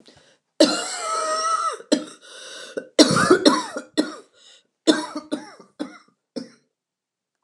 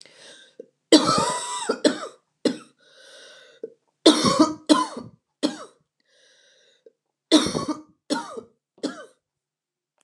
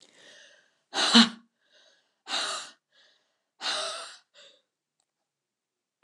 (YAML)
cough_length: 7.4 s
cough_amplitude: 29204
cough_signal_mean_std_ratio: 0.42
three_cough_length: 10.0 s
three_cough_amplitude: 29190
three_cough_signal_mean_std_ratio: 0.35
exhalation_length: 6.0 s
exhalation_amplitude: 19696
exhalation_signal_mean_std_ratio: 0.26
survey_phase: beta (2021-08-13 to 2022-03-07)
age: 45-64
gender: Female
wearing_mask: 'No'
symptom_cough_any: true
symptom_new_continuous_cough: true
symptom_runny_or_blocked_nose: true
symptom_shortness_of_breath: true
symptom_sore_throat: true
symptom_fatigue: true
symptom_onset: 4 days
smoker_status: Never smoked
respiratory_condition_asthma: false
respiratory_condition_other: false
recruitment_source: Test and Trace
submission_delay: 2 days
covid_test_result: Positive
covid_test_method: RT-qPCR